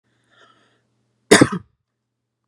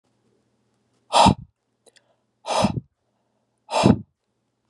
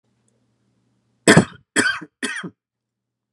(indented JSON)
{
  "cough_length": "2.5 s",
  "cough_amplitude": 32768,
  "cough_signal_mean_std_ratio": 0.2,
  "exhalation_length": "4.7 s",
  "exhalation_amplitude": 28344,
  "exhalation_signal_mean_std_ratio": 0.29,
  "three_cough_length": "3.3 s",
  "three_cough_amplitude": 32767,
  "three_cough_signal_mean_std_ratio": 0.27,
  "survey_phase": "beta (2021-08-13 to 2022-03-07)",
  "age": "18-44",
  "gender": "Male",
  "wearing_mask": "No",
  "symptom_cough_any": true,
  "symptom_runny_or_blocked_nose": true,
  "symptom_sore_throat": true,
  "symptom_fatigue": true,
  "symptom_headache": true,
  "smoker_status": "Ex-smoker",
  "respiratory_condition_asthma": true,
  "respiratory_condition_other": false,
  "recruitment_source": "Test and Trace",
  "submission_delay": "1 day",
  "covid_test_result": "Positive",
  "covid_test_method": "RT-qPCR",
  "covid_ct_value": 20.6,
  "covid_ct_gene": "ORF1ab gene",
  "covid_ct_mean": 21.1,
  "covid_viral_load": "120000 copies/ml",
  "covid_viral_load_category": "Low viral load (10K-1M copies/ml)"
}